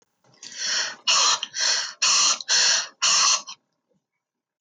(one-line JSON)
{"exhalation_length": "4.6 s", "exhalation_amplitude": 15943, "exhalation_signal_mean_std_ratio": 0.6, "survey_phase": "beta (2021-08-13 to 2022-03-07)", "age": "65+", "gender": "Female", "wearing_mask": "No", "symptom_none": true, "smoker_status": "Ex-smoker", "respiratory_condition_asthma": false, "respiratory_condition_other": false, "recruitment_source": "REACT", "submission_delay": "3 days", "covid_test_result": "Negative", "covid_test_method": "RT-qPCR"}